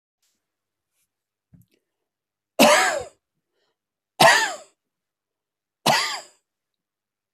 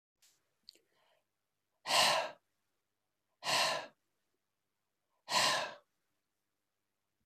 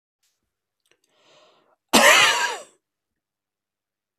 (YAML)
three_cough_length: 7.3 s
three_cough_amplitude: 27213
three_cough_signal_mean_std_ratio: 0.28
exhalation_length: 7.3 s
exhalation_amplitude: 6090
exhalation_signal_mean_std_ratio: 0.32
cough_length: 4.2 s
cough_amplitude: 31644
cough_signal_mean_std_ratio: 0.29
survey_phase: alpha (2021-03-01 to 2021-08-12)
age: 45-64
gender: Male
wearing_mask: 'No'
symptom_none: true
smoker_status: Ex-smoker
respiratory_condition_asthma: false
respiratory_condition_other: false
recruitment_source: REACT
submission_delay: 3 days
covid_test_result: Negative
covid_test_method: RT-qPCR